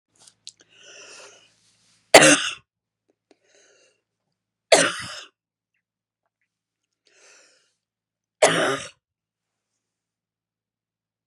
{
  "three_cough_length": "11.3 s",
  "three_cough_amplitude": 32768,
  "three_cough_signal_mean_std_ratio": 0.2,
  "survey_phase": "beta (2021-08-13 to 2022-03-07)",
  "age": "45-64",
  "gender": "Female",
  "wearing_mask": "No",
  "symptom_fatigue": true,
  "symptom_onset": "12 days",
  "smoker_status": "Never smoked",
  "respiratory_condition_asthma": false,
  "respiratory_condition_other": false,
  "recruitment_source": "REACT",
  "submission_delay": "2 days",
  "covid_test_result": "Negative",
  "covid_test_method": "RT-qPCR",
  "influenza_a_test_result": "Negative",
  "influenza_b_test_result": "Negative"
}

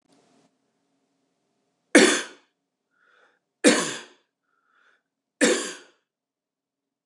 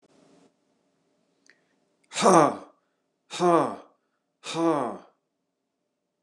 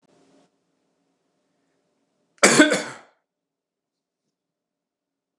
{
  "three_cough_length": "7.1 s",
  "three_cough_amplitude": 26940,
  "three_cough_signal_mean_std_ratio": 0.25,
  "exhalation_length": "6.2 s",
  "exhalation_amplitude": 20037,
  "exhalation_signal_mean_std_ratio": 0.31,
  "cough_length": "5.4 s",
  "cough_amplitude": 29203,
  "cough_signal_mean_std_ratio": 0.2,
  "survey_phase": "beta (2021-08-13 to 2022-03-07)",
  "age": "18-44",
  "gender": "Male",
  "wearing_mask": "No",
  "symptom_cough_any": true,
  "symptom_new_continuous_cough": true,
  "symptom_runny_or_blocked_nose": true,
  "symptom_fatigue": true,
  "smoker_status": "Never smoked",
  "respiratory_condition_asthma": false,
  "respiratory_condition_other": false,
  "recruitment_source": "Test and Trace",
  "submission_delay": "-1 day",
  "covid_test_result": "Positive",
  "covid_test_method": "LFT"
}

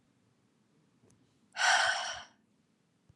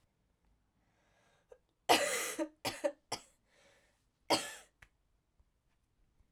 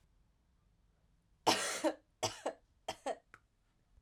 {
  "exhalation_length": "3.2 s",
  "exhalation_amplitude": 6361,
  "exhalation_signal_mean_std_ratio": 0.34,
  "cough_length": "6.3 s",
  "cough_amplitude": 8806,
  "cough_signal_mean_std_ratio": 0.28,
  "three_cough_length": "4.0 s",
  "three_cough_amplitude": 7312,
  "three_cough_signal_mean_std_ratio": 0.33,
  "survey_phase": "alpha (2021-03-01 to 2021-08-12)",
  "age": "18-44",
  "gender": "Female",
  "wearing_mask": "No",
  "symptom_cough_any": true,
  "symptom_fatigue": true,
  "symptom_headache": true,
  "symptom_change_to_sense_of_smell_or_taste": true,
  "smoker_status": "Never smoked",
  "respiratory_condition_asthma": false,
  "respiratory_condition_other": false,
  "recruitment_source": "Test and Trace",
  "submission_delay": "4 days",
  "covid_test_result": "Positive",
  "covid_test_method": "RT-qPCR"
}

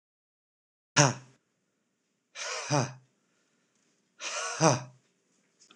{
  "exhalation_length": "5.8 s",
  "exhalation_amplitude": 23573,
  "exhalation_signal_mean_std_ratio": 0.29,
  "survey_phase": "alpha (2021-03-01 to 2021-08-12)",
  "age": "18-44",
  "gender": "Male",
  "wearing_mask": "No",
  "symptom_none": true,
  "smoker_status": "Never smoked",
  "respiratory_condition_asthma": false,
  "respiratory_condition_other": false,
  "recruitment_source": "REACT",
  "submission_delay": "4 days",
  "covid_test_result": "Negative",
  "covid_test_method": "RT-qPCR"
}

